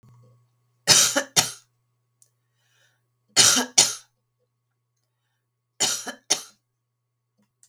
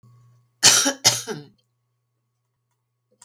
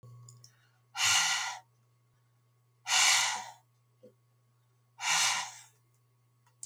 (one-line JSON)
{"three_cough_length": "7.7 s", "three_cough_amplitude": 32767, "three_cough_signal_mean_std_ratio": 0.29, "cough_length": "3.2 s", "cough_amplitude": 32768, "cough_signal_mean_std_ratio": 0.29, "exhalation_length": "6.7 s", "exhalation_amplitude": 8301, "exhalation_signal_mean_std_ratio": 0.41, "survey_phase": "beta (2021-08-13 to 2022-03-07)", "age": "65+", "gender": "Female", "wearing_mask": "No", "symptom_sore_throat": true, "smoker_status": "Never smoked", "respiratory_condition_asthma": false, "respiratory_condition_other": false, "recruitment_source": "REACT", "submission_delay": "2 days", "covid_test_result": "Negative", "covid_test_method": "RT-qPCR"}